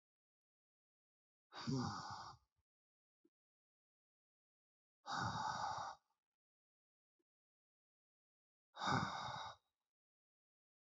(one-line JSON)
{"exhalation_length": "10.9 s", "exhalation_amplitude": 1679, "exhalation_signal_mean_std_ratio": 0.36, "survey_phase": "beta (2021-08-13 to 2022-03-07)", "age": "18-44", "gender": "Male", "wearing_mask": "No", "symptom_cough_any": true, "symptom_runny_or_blocked_nose": true, "symptom_fatigue": true, "symptom_fever_high_temperature": true, "symptom_headache": true, "smoker_status": "Current smoker (1 to 10 cigarettes per day)", "respiratory_condition_asthma": false, "respiratory_condition_other": false, "recruitment_source": "Test and Trace", "submission_delay": "1 day", "covid_test_result": "Positive", "covid_test_method": "RT-qPCR", "covid_ct_value": 27.6, "covid_ct_gene": "ORF1ab gene", "covid_ct_mean": 28.2, "covid_viral_load": "550 copies/ml", "covid_viral_load_category": "Minimal viral load (< 10K copies/ml)"}